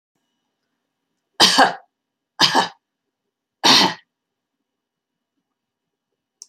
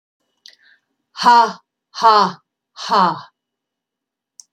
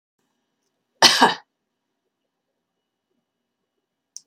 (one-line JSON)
{"three_cough_length": "6.5 s", "three_cough_amplitude": 32768, "three_cough_signal_mean_std_ratio": 0.28, "exhalation_length": "4.5 s", "exhalation_amplitude": 30817, "exhalation_signal_mean_std_ratio": 0.36, "cough_length": "4.3 s", "cough_amplitude": 30850, "cough_signal_mean_std_ratio": 0.2, "survey_phase": "beta (2021-08-13 to 2022-03-07)", "age": "65+", "gender": "Female", "wearing_mask": "No", "symptom_none": true, "smoker_status": "Never smoked", "respiratory_condition_asthma": false, "respiratory_condition_other": false, "recruitment_source": "REACT", "submission_delay": "3 days", "covid_test_result": "Negative", "covid_test_method": "RT-qPCR", "influenza_a_test_result": "Negative", "influenza_b_test_result": "Negative"}